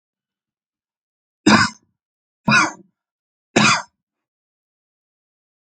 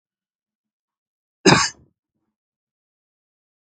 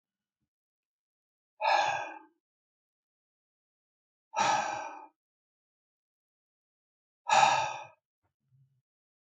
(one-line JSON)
{"three_cough_length": "5.6 s", "three_cough_amplitude": 31118, "three_cough_signal_mean_std_ratio": 0.27, "cough_length": "3.8 s", "cough_amplitude": 31706, "cough_signal_mean_std_ratio": 0.18, "exhalation_length": "9.4 s", "exhalation_amplitude": 10507, "exhalation_signal_mean_std_ratio": 0.3, "survey_phase": "alpha (2021-03-01 to 2021-08-12)", "age": "45-64", "gender": "Male", "wearing_mask": "No", "symptom_none": true, "smoker_status": "Never smoked", "respiratory_condition_asthma": false, "respiratory_condition_other": false, "recruitment_source": "REACT", "submission_delay": "2 days", "covid_test_result": "Negative", "covid_test_method": "RT-qPCR"}